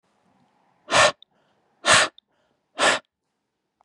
{"exhalation_length": "3.8 s", "exhalation_amplitude": 26247, "exhalation_signal_mean_std_ratio": 0.31, "survey_phase": "beta (2021-08-13 to 2022-03-07)", "age": "18-44", "gender": "Male", "wearing_mask": "No", "symptom_cough_any": true, "symptom_sore_throat": true, "symptom_onset": "4 days", "smoker_status": "Never smoked", "respiratory_condition_asthma": false, "respiratory_condition_other": false, "recruitment_source": "Test and Trace", "submission_delay": "1 day", "covid_test_result": "Positive", "covid_test_method": "RT-qPCR", "covid_ct_value": 20.8, "covid_ct_gene": "N gene"}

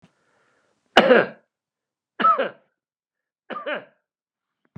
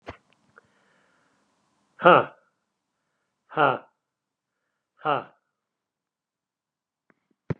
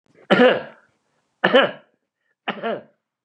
{"cough_length": "4.8 s", "cough_amplitude": 32768, "cough_signal_mean_std_ratio": 0.27, "exhalation_length": "7.6 s", "exhalation_amplitude": 27875, "exhalation_signal_mean_std_ratio": 0.19, "three_cough_length": "3.2 s", "three_cough_amplitude": 32517, "three_cough_signal_mean_std_ratio": 0.35, "survey_phase": "beta (2021-08-13 to 2022-03-07)", "age": "65+", "gender": "Male", "wearing_mask": "No", "symptom_none": true, "smoker_status": "Ex-smoker", "respiratory_condition_asthma": true, "respiratory_condition_other": false, "recruitment_source": "REACT", "submission_delay": "3 days", "covid_test_result": "Negative", "covid_test_method": "RT-qPCR", "influenza_a_test_result": "Negative", "influenza_b_test_result": "Negative"}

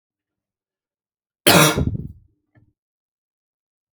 {"cough_length": "3.9 s", "cough_amplitude": 32768, "cough_signal_mean_std_ratio": 0.26, "survey_phase": "alpha (2021-03-01 to 2021-08-12)", "age": "18-44", "gender": "Male", "wearing_mask": "No", "symptom_cough_any": true, "symptom_onset": "10 days", "smoker_status": "Never smoked", "respiratory_condition_asthma": false, "respiratory_condition_other": false, "recruitment_source": "REACT", "submission_delay": "1 day", "covid_test_result": "Negative", "covid_test_method": "RT-qPCR"}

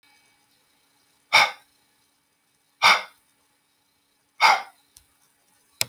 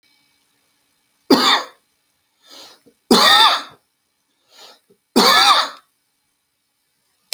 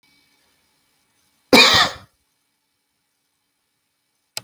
{"exhalation_length": "5.9 s", "exhalation_amplitude": 32768, "exhalation_signal_mean_std_ratio": 0.24, "three_cough_length": "7.3 s", "three_cough_amplitude": 31292, "three_cough_signal_mean_std_ratio": 0.35, "cough_length": "4.4 s", "cough_amplitude": 31647, "cough_signal_mean_std_ratio": 0.23, "survey_phase": "alpha (2021-03-01 to 2021-08-12)", "age": "45-64", "gender": "Male", "wearing_mask": "No", "symptom_none": true, "smoker_status": "Never smoked", "respiratory_condition_asthma": false, "respiratory_condition_other": false, "recruitment_source": "REACT", "submission_delay": "3 days", "covid_test_result": "Negative", "covid_test_method": "RT-qPCR"}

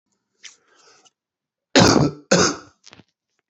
{"cough_length": "3.5 s", "cough_amplitude": 29368, "cough_signal_mean_std_ratio": 0.33, "survey_phase": "beta (2021-08-13 to 2022-03-07)", "age": "45-64", "gender": "Male", "wearing_mask": "Yes", "symptom_new_continuous_cough": true, "symptom_abdominal_pain": true, "symptom_diarrhoea": true, "symptom_fatigue": true, "symptom_change_to_sense_of_smell_or_taste": true, "symptom_loss_of_taste": true, "symptom_onset": "6 days", "smoker_status": "Current smoker (1 to 10 cigarettes per day)", "respiratory_condition_asthma": false, "respiratory_condition_other": false, "recruitment_source": "Test and Trace", "submission_delay": "2 days", "covid_test_result": "Positive", "covid_test_method": "RT-qPCR", "covid_ct_value": 18.4, "covid_ct_gene": "N gene", "covid_ct_mean": 18.7, "covid_viral_load": "710000 copies/ml", "covid_viral_load_category": "Low viral load (10K-1M copies/ml)"}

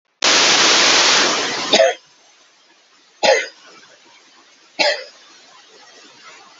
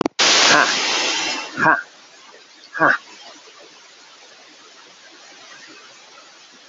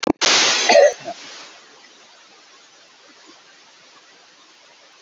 {"three_cough_length": "6.6 s", "three_cough_amplitude": 30353, "three_cough_signal_mean_std_ratio": 0.49, "exhalation_length": "6.7 s", "exhalation_amplitude": 29040, "exhalation_signal_mean_std_ratio": 0.44, "cough_length": "5.0 s", "cough_amplitude": 28277, "cough_signal_mean_std_ratio": 0.35, "survey_phase": "beta (2021-08-13 to 2022-03-07)", "age": "45-64", "gender": "Male", "wearing_mask": "No", "symptom_runny_or_blocked_nose": true, "symptom_fatigue": true, "symptom_fever_high_temperature": true, "symptom_change_to_sense_of_smell_or_taste": true, "smoker_status": "Never smoked", "respiratory_condition_asthma": false, "respiratory_condition_other": false, "recruitment_source": "Test and Trace", "submission_delay": "2 days", "covid_test_result": "Positive", "covid_test_method": "RT-qPCR", "covid_ct_value": 18.0, "covid_ct_gene": "S gene", "covid_ct_mean": 18.5, "covid_viral_load": "850000 copies/ml", "covid_viral_load_category": "Low viral load (10K-1M copies/ml)"}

